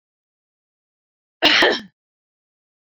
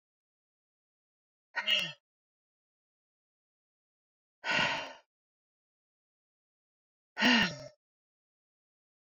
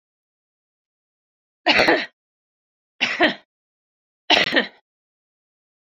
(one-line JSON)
{"cough_length": "2.9 s", "cough_amplitude": 27827, "cough_signal_mean_std_ratio": 0.28, "exhalation_length": "9.1 s", "exhalation_amplitude": 6811, "exhalation_signal_mean_std_ratio": 0.26, "three_cough_length": "6.0 s", "three_cough_amplitude": 27941, "three_cough_signal_mean_std_ratio": 0.3, "survey_phase": "beta (2021-08-13 to 2022-03-07)", "age": "45-64", "gender": "Female", "wearing_mask": "No", "symptom_none": true, "smoker_status": "Ex-smoker", "respiratory_condition_asthma": false, "respiratory_condition_other": false, "recruitment_source": "REACT", "submission_delay": "1 day", "covid_test_result": "Negative", "covid_test_method": "RT-qPCR"}